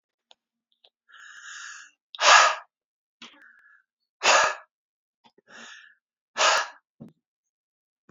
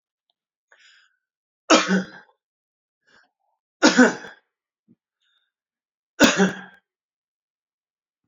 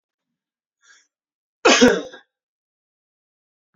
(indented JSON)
{
  "exhalation_length": "8.1 s",
  "exhalation_amplitude": 25859,
  "exhalation_signal_mean_std_ratio": 0.28,
  "three_cough_length": "8.3 s",
  "three_cough_amplitude": 30200,
  "three_cough_signal_mean_std_ratio": 0.25,
  "cough_length": "3.8 s",
  "cough_amplitude": 30086,
  "cough_signal_mean_std_ratio": 0.24,
  "survey_phase": "beta (2021-08-13 to 2022-03-07)",
  "age": "45-64",
  "gender": "Male",
  "wearing_mask": "No",
  "symptom_none": true,
  "smoker_status": "Ex-smoker",
  "respiratory_condition_asthma": false,
  "respiratory_condition_other": false,
  "recruitment_source": "REACT",
  "submission_delay": "2 days",
  "covid_test_result": "Negative",
  "covid_test_method": "RT-qPCR",
  "influenza_a_test_result": "Negative",
  "influenza_b_test_result": "Negative"
}